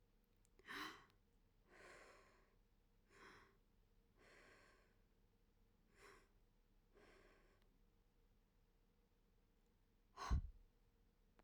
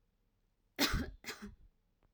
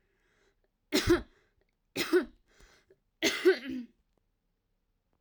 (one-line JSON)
{"exhalation_length": "11.4 s", "exhalation_amplitude": 993, "exhalation_signal_mean_std_ratio": 0.28, "cough_length": "2.1 s", "cough_amplitude": 4388, "cough_signal_mean_std_ratio": 0.35, "three_cough_length": "5.2 s", "three_cough_amplitude": 7587, "three_cough_signal_mean_std_ratio": 0.32, "survey_phase": "beta (2021-08-13 to 2022-03-07)", "age": "18-44", "gender": "Female", "wearing_mask": "No", "symptom_none": true, "smoker_status": "Never smoked", "respiratory_condition_asthma": false, "respiratory_condition_other": false, "recruitment_source": "REACT", "submission_delay": "1 day", "covid_test_result": "Negative", "covid_test_method": "RT-qPCR"}